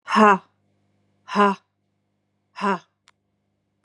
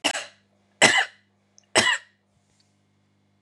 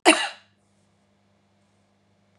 {"exhalation_length": "3.8 s", "exhalation_amplitude": 26689, "exhalation_signal_mean_std_ratio": 0.3, "three_cough_length": "3.4 s", "three_cough_amplitude": 31141, "three_cough_signal_mean_std_ratio": 0.31, "cough_length": "2.4 s", "cough_amplitude": 32493, "cough_signal_mean_std_ratio": 0.21, "survey_phase": "beta (2021-08-13 to 2022-03-07)", "age": "45-64", "gender": "Female", "wearing_mask": "No", "symptom_none": true, "smoker_status": "Ex-smoker", "respiratory_condition_asthma": false, "respiratory_condition_other": false, "recruitment_source": "REACT", "submission_delay": "2 days", "covid_test_result": "Negative", "covid_test_method": "RT-qPCR", "influenza_a_test_result": "Negative", "influenza_b_test_result": "Negative"}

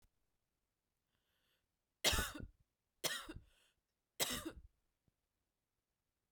{"three_cough_length": "6.3 s", "three_cough_amplitude": 3019, "three_cough_signal_mean_std_ratio": 0.27, "survey_phase": "beta (2021-08-13 to 2022-03-07)", "age": "18-44", "gender": "Female", "wearing_mask": "No", "symptom_cough_any": true, "symptom_runny_or_blocked_nose": true, "symptom_sore_throat": true, "symptom_headache": true, "symptom_onset": "2 days", "smoker_status": "Never smoked", "respiratory_condition_asthma": false, "respiratory_condition_other": false, "recruitment_source": "Test and Trace", "submission_delay": "1 day", "covid_test_result": "Positive", "covid_test_method": "RT-qPCR"}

